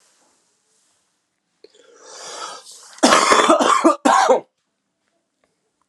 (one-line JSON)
{"cough_length": "5.9 s", "cough_amplitude": 32768, "cough_signal_mean_std_ratio": 0.39, "survey_phase": "alpha (2021-03-01 to 2021-08-12)", "age": "18-44", "gender": "Male", "wearing_mask": "No", "symptom_cough_any": true, "symptom_fever_high_temperature": true, "symptom_onset": "5 days", "smoker_status": "Never smoked", "respiratory_condition_asthma": false, "respiratory_condition_other": false, "recruitment_source": "Test and Trace", "submission_delay": "2 days", "covid_test_result": "Positive", "covid_test_method": "RT-qPCR", "covid_ct_value": 12.8, "covid_ct_gene": "N gene", "covid_ct_mean": 15.0, "covid_viral_load": "12000000 copies/ml", "covid_viral_load_category": "High viral load (>1M copies/ml)"}